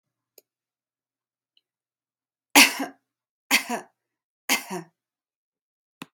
{
  "three_cough_length": "6.1 s",
  "three_cough_amplitude": 32358,
  "three_cough_signal_mean_std_ratio": 0.21,
  "survey_phase": "beta (2021-08-13 to 2022-03-07)",
  "age": "45-64",
  "gender": "Female",
  "wearing_mask": "No",
  "symptom_sore_throat": true,
  "smoker_status": "Never smoked",
  "respiratory_condition_asthma": false,
  "respiratory_condition_other": false,
  "recruitment_source": "REACT",
  "submission_delay": "1 day",
  "covid_test_result": "Negative",
  "covid_test_method": "RT-qPCR"
}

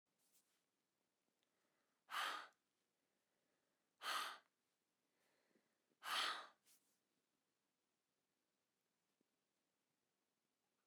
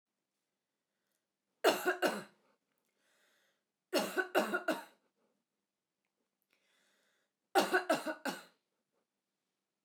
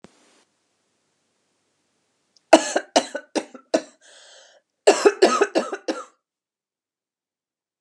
{
  "exhalation_length": "10.9 s",
  "exhalation_amplitude": 897,
  "exhalation_signal_mean_std_ratio": 0.25,
  "three_cough_length": "9.8 s",
  "three_cough_amplitude": 6950,
  "three_cough_signal_mean_std_ratio": 0.31,
  "cough_length": "7.8 s",
  "cough_amplitude": 32768,
  "cough_signal_mean_std_ratio": 0.26,
  "survey_phase": "alpha (2021-03-01 to 2021-08-12)",
  "age": "45-64",
  "gender": "Female",
  "wearing_mask": "No",
  "symptom_cough_any": true,
  "symptom_fatigue": true,
  "symptom_onset": "12 days",
  "smoker_status": "Ex-smoker",
  "respiratory_condition_asthma": false,
  "respiratory_condition_other": true,
  "recruitment_source": "REACT",
  "submission_delay": "1 day",
  "covid_test_result": "Negative",
  "covid_test_method": "RT-qPCR"
}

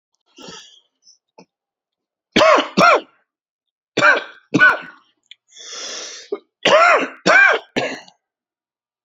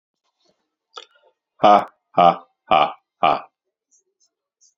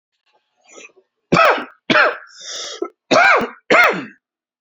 {
  "three_cough_length": "9.0 s",
  "three_cough_amplitude": 29839,
  "three_cough_signal_mean_std_ratio": 0.39,
  "exhalation_length": "4.8 s",
  "exhalation_amplitude": 29552,
  "exhalation_signal_mean_std_ratio": 0.28,
  "cough_length": "4.6 s",
  "cough_amplitude": 31083,
  "cough_signal_mean_std_ratio": 0.45,
  "survey_phase": "beta (2021-08-13 to 2022-03-07)",
  "age": "45-64",
  "gender": "Male",
  "wearing_mask": "No",
  "symptom_cough_any": true,
  "symptom_new_continuous_cough": true,
  "symptom_runny_or_blocked_nose": true,
  "symptom_shortness_of_breath": true,
  "symptom_diarrhoea": true,
  "symptom_fatigue": true,
  "symptom_fever_high_temperature": true,
  "symptom_headache": true,
  "symptom_onset": "4 days",
  "smoker_status": "Ex-smoker",
  "respiratory_condition_asthma": false,
  "respiratory_condition_other": false,
  "recruitment_source": "Test and Trace",
  "submission_delay": "2 days",
  "covid_test_result": "Positive",
  "covid_test_method": "RT-qPCR",
  "covid_ct_value": 18.4,
  "covid_ct_gene": "ORF1ab gene",
  "covid_ct_mean": 19.4,
  "covid_viral_load": "430000 copies/ml",
  "covid_viral_load_category": "Low viral load (10K-1M copies/ml)"
}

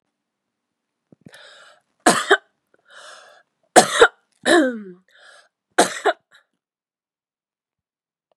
{
  "three_cough_length": "8.4 s",
  "three_cough_amplitude": 32768,
  "three_cough_signal_mean_std_ratio": 0.26,
  "survey_phase": "beta (2021-08-13 to 2022-03-07)",
  "age": "18-44",
  "gender": "Female",
  "wearing_mask": "No",
  "symptom_cough_any": true,
  "symptom_sore_throat": true,
  "symptom_onset": "4 days",
  "smoker_status": "Ex-smoker",
  "respiratory_condition_asthma": true,
  "respiratory_condition_other": false,
  "recruitment_source": "Test and Trace",
  "submission_delay": "1 day",
  "covid_test_result": "Negative",
  "covid_test_method": "RT-qPCR"
}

